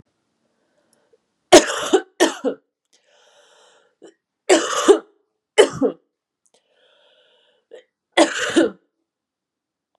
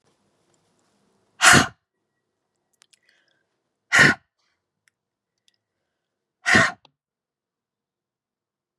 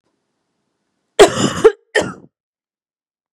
{"three_cough_length": "10.0 s", "three_cough_amplitude": 32768, "three_cough_signal_mean_std_ratio": 0.28, "exhalation_length": "8.8 s", "exhalation_amplitude": 32531, "exhalation_signal_mean_std_ratio": 0.22, "cough_length": "3.3 s", "cough_amplitude": 32768, "cough_signal_mean_std_ratio": 0.27, "survey_phase": "beta (2021-08-13 to 2022-03-07)", "age": "18-44", "gender": "Female", "wearing_mask": "No", "symptom_cough_any": true, "symptom_runny_or_blocked_nose": true, "symptom_change_to_sense_of_smell_or_taste": true, "symptom_loss_of_taste": true, "symptom_onset": "4 days", "smoker_status": "Never smoked", "respiratory_condition_asthma": false, "respiratory_condition_other": false, "recruitment_source": "Test and Trace", "submission_delay": "2 days", "covid_test_result": "Positive", "covid_test_method": "RT-qPCR", "covid_ct_value": 16.3, "covid_ct_gene": "ORF1ab gene", "covid_ct_mean": 16.4, "covid_viral_load": "4100000 copies/ml", "covid_viral_load_category": "High viral load (>1M copies/ml)"}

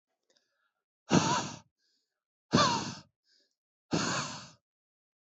{"exhalation_length": "5.2 s", "exhalation_amplitude": 9348, "exhalation_signal_mean_std_ratio": 0.36, "survey_phase": "alpha (2021-03-01 to 2021-08-12)", "age": "45-64", "gender": "Male", "wearing_mask": "No", "symptom_none": true, "smoker_status": "Current smoker (1 to 10 cigarettes per day)", "respiratory_condition_asthma": true, "respiratory_condition_other": false, "recruitment_source": "REACT", "submission_delay": "1 day", "covid_test_result": "Negative", "covid_test_method": "RT-qPCR"}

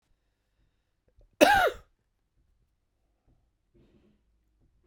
{"cough_length": "4.9 s", "cough_amplitude": 26151, "cough_signal_mean_std_ratio": 0.2, "survey_phase": "beta (2021-08-13 to 2022-03-07)", "age": "45-64", "gender": "Male", "wearing_mask": "No", "symptom_cough_any": true, "symptom_shortness_of_breath": true, "symptom_sore_throat": true, "symptom_fatigue": true, "symptom_headache": true, "symptom_change_to_sense_of_smell_or_taste": true, "smoker_status": "Ex-smoker", "respiratory_condition_asthma": false, "respiratory_condition_other": false, "recruitment_source": "Test and Trace", "submission_delay": "1 day", "covid_test_result": "Positive", "covid_test_method": "RT-qPCR", "covid_ct_value": 19.7, "covid_ct_gene": "ORF1ab gene", "covid_ct_mean": 20.2, "covid_viral_load": "240000 copies/ml", "covid_viral_load_category": "Low viral load (10K-1M copies/ml)"}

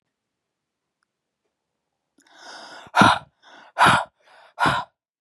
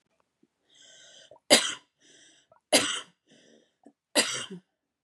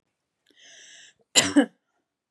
{"exhalation_length": "5.2 s", "exhalation_amplitude": 31061, "exhalation_signal_mean_std_ratio": 0.29, "three_cough_length": "5.0 s", "three_cough_amplitude": 20827, "three_cough_signal_mean_std_ratio": 0.27, "cough_length": "2.3 s", "cough_amplitude": 26405, "cough_signal_mean_std_ratio": 0.25, "survey_phase": "beta (2021-08-13 to 2022-03-07)", "age": "18-44", "gender": "Female", "wearing_mask": "No", "symptom_change_to_sense_of_smell_or_taste": true, "smoker_status": "Never smoked", "respiratory_condition_asthma": false, "respiratory_condition_other": false, "recruitment_source": "Test and Trace", "submission_delay": "37 days", "covid_test_result": "Negative", "covid_test_method": "RT-qPCR"}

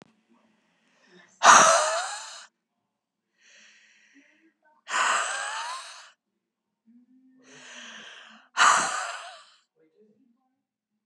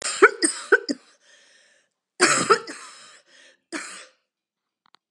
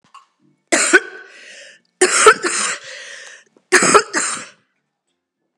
{"exhalation_length": "11.1 s", "exhalation_amplitude": 28247, "exhalation_signal_mean_std_ratio": 0.3, "cough_length": "5.1 s", "cough_amplitude": 32012, "cough_signal_mean_std_ratio": 0.31, "three_cough_length": "5.6 s", "three_cough_amplitude": 32768, "three_cough_signal_mean_std_ratio": 0.4, "survey_phase": "beta (2021-08-13 to 2022-03-07)", "age": "45-64", "gender": "Female", "wearing_mask": "No", "symptom_cough_any": true, "symptom_runny_or_blocked_nose": true, "symptom_shortness_of_breath": true, "symptom_abdominal_pain": true, "symptom_fatigue": true, "symptom_onset": "5 days", "smoker_status": "Never smoked", "respiratory_condition_asthma": false, "respiratory_condition_other": false, "recruitment_source": "Test and Trace", "submission_delay": "2 days", "covid_test_result": "Positive", "covid_test_method": "RT-qPCR", "covid_ct_value": 27.1, "covid_ct_gene": "ORF1ab gene"}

